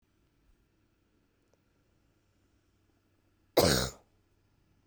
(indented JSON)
{
  "cough_length": "4.9 s",
  "cough_amplitude": 10571,
  "cough_signal_mean_std_ratio": 0.2,
  "survey_phase": "beta (2021-08-13 to 2022-03-07)",
  "age": "18-44",
  "gender": "Female",
  "wearing_mask": "No",
  "symptom_cough_any": true,
  "symptom_runny_or_blocked_nose": true,
  "symptom_sore_throat": true,
  "symptom_fatigue": true,
  "symptom_headache": true,
  "symptom_onset": "3 days",
  "smoker_status": "Never smoked",
  "respiratory_condition_asthma": false,
  "respiratory_condition_other": false,
  "recruitment_source": "Test and Trace",
  "submission_delay": "2 days",
  "covid_test_result": "Positive",
  "covid_test_method": "RT-qPCR"
}